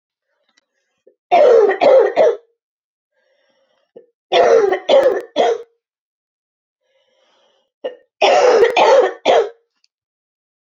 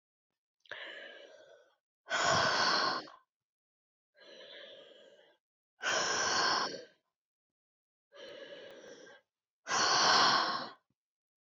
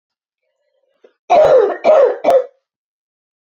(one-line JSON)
{"three_cough_length": "10.7 s", "three_cough_amplitude": 30476, "three_cough_signal_mean_std_ratio": 0.47, "exhalation_length": "11.5 s", "exhalation_amplitude": 6298, "exhalation_signal_mean_std_ratio": 0.45, "cough_length": "3.4 s", "cough_amplitude": 27969, "cough_signal_mean_std_ratio": 0.47, "survey_phase": "beta (2021-08-13 to 2022-03-07)", "age": "45-64", "gender": "Female", "wearing_mask": "No", "symptom_cough_any": true, "symptom_runny_or_blocked_nose": true, "symptom_fatigue": true, "symptom_change_to_sense_of_smell_or_taste": true, "symptom_other": true, "symptom_onset": "4 days", "smoker_status": "Never smoked", "respiratory_condition_asthma": false, "respiratory_condition_other": false, "recruitment_source": "Test and Trace", "submission_delay": "2 days", "covid_test_result": "Positive", "covid_test_method": "RT-qPCR", "covid_ct_value": 28.8, "covid_ct_gene": "ORF1ab gene"}